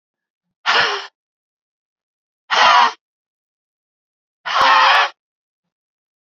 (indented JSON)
{
  "exhalation_length": "6.2 s",
  "exhalation_amplitude": 32218,
  "exhalation_signal_mean_std_ratio": 0.38,
  "survey_phase": "beta (2021-08-13 to 2022-03-07)",
  "age": "18-44",
  "gender": "Female",
  "wearing_mask": "No",
  "symptom_cough_any": true,
  "symptom_new_continuous_cough": true,
  "symptom_runny_or_blocked_nose": true,
  "symptom_shortness_of_breath": true,
  "symptom_sore_throat": true,
  "symptom_abdominal_pain": true,
  "symptom_fatigue": true,
  "symptom_fever_high_temperature": true,
  "symptom_onset": "5 days",
  "smoker_status": "Never smoked",
  "respiratory_condition_asthma": true,
  "respiratory_condition_other": false,
  "recruitment_source": "Test and Trace",
  "submission_delay": "2 days",
  "covid_test_result": "Positive",
  "covid_test_method": "RT-qPCR",
  "covid_ct_value": 14.7,
  "covid_ct_gene": "ORF1ab gene",
  "covid_ct_mean": 15.7,
  "covid_viral_load": "6900000 copies/ml",
  "covid_viral_load_category": "High viral load (>1M copies/ml)"
}